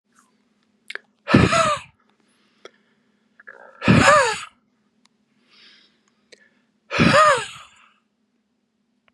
exhalation_length: 9.1 s
exhalation_amplitude: 32060
exhalation_signal_mean_std_ratio: 0.33
survey_phase: beta (2021-08-13 to 2022-03-07)
age: 45-64
gender: Male
wearing_mask: 'No'
symptom_cough_any: true
symptom_runny_or_blocked_nose: true
symptom_sore_throat: true
symptom_headache: true
smoker_status: Never smoked
respiratory_condition_asthma: false
respiratory_condition_other: false
recruitment_source: Test and Trace
submission_delay: 1 day
covid_test_result: Positive
covid_test_method: LFT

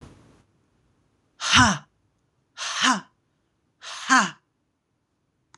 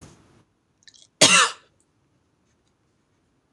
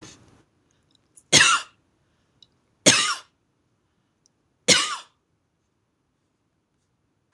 exhalation_length: 5.6 s
exhalation_amplitude: 25030
exhalation_signal_mean_std_ratio: 0.31
cough_length: 3.5 s
cough_amplitude: 26027
cough_signal_mean_std_ratio: 0.23
three_cough_length: 7.3 s
three_cough_amplitude: 26027
three_cough_signal_mean_std_ratio: 0.25
survey_phase: beta (2021-08-13 to 2022-03-07)
age: 45-64
gender: Female
wearing_mask: 'No'
symptom_diarrhoea: true
symptom_onset: 3 days
smoker_status: Ex-smoker
respiratory_condition_asthma: false
respiratory_condition_other: false
recruitment_source: REACT
submission_delay: 1 day
covid_test_result: Negative
covid_test_method: RT-qPCR
influenza_a_test_result: Negative
influenza_b_test_result: Negative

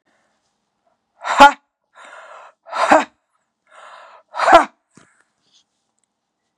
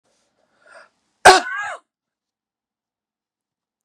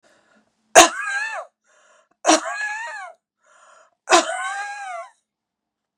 exhalation_length: 6.6 s
exhalation_amplitude: 32768
exhalation_signal_mean_std_ratio: 0.25
cough_length: 3.8 s
cough_amplitude: 32768
cough_signal_mean_std_ratio: 0.19
three_cough_length: 6.0 s
three_cough_amplitude: 32768
three_cough_signal_mean_std_ratio: 0.33
survey_phase: beta (2021-08-13 to 2022-03-07)
age: 65+
gender: Female
wearing_mask: 'No'
symptom_none: true
smoker_status: Never smoked
respiratory_condition_asthma: false
respiratory_condition_other: false
recruitment_source: REACT
submission_delay: 2 days
covid_test_result: Negative
covid_test_method: RT-qPCR
influenza_a_test_result: Unknown/Void
influenza_b_test_result: Unknown/Void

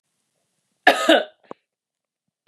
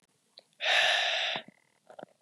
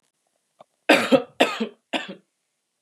cough_length: 2.5 s
cough_amplitude: 32709
cough_signal_mean_std_ratio: 0.27
exhalation_length: 2.2 s
exhalation_amplitude: 8224
exhalation_signal_mean_std_ratio: 0.51
three_cough_length: 2.8 s
three_cough_amplitude: 28207
three_cough_signal_mean_std_ratio: 0.33
survey_phase: beta (2021-08-13 to 2022-03-07)
age: 18-44
gender: Female
wearing_mask: 'No'
symptom_fatigue: true
symptom_onset: 12 days
smoker_status: Never smoked
respiratory_condition_asthma: false
respiratory_condition_other: false
recruitment_source: REACT
submission_delay: 1 day
covid_test_result: Negative
covid_test_method: RT-qPCR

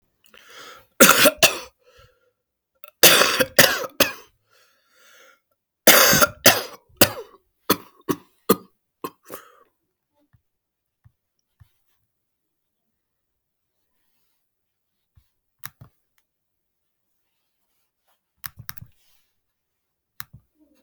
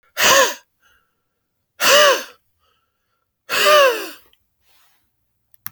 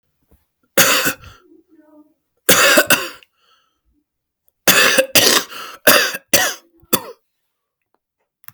three_cough_length: 20.8 s
three_cough_amplitude: 32768
three_cough_signal_mean_std_ratio: 0.23
exhalation_length: 5.7 s
exhalation_amplitude: 32768
exhalation_signal_mean_std_ratio: 0.38
cough_length: 8.5 s
cough_amplitude: 32768
cough_signal_mean_std_ratio: 0.39
survey_phase: alpha (2021-03-01 to 2021-08-12)
age: 45-64
gender: Male
wearing_mask: 'No'
symptom_cough_any: true
symptom_new_continuous_cough: true
symptom_shortness_of_breath: true
symptom_onset: 11 days
smoker_status: Never smoked
respiratory_condition_asthma: false
respiratory_condition_other: false
recruitment_source: REACT
submission_delay: 2 days
covid_test_result: Negative
covid_test_method: RT-qPCR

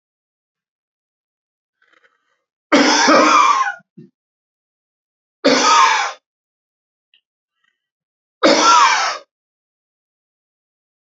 three_cough_length: 11.2 s
three_cough_amplitude: 32046
three_cough_signal_mean_std_ratio: 0.38
survey_phase: beta (2021-08-13 to 2022-03-07)
age: 45-64
gender: Male
wearing_mask: 'No'
symptom_cough_any: true
symptom_fatigue: true
symptom_other: true
symptom_onset: 8 days
smoker_status: Never smoked
respiratory_condition_asthma: false
respiratory_condition_other: false
recruitment_source: REACT
submission_delay: 1 day
covid_test_result: Negative
covid_test_method: RT-qPCR
influenza_a_test_result: Negative
influenza_b_test_result: Negative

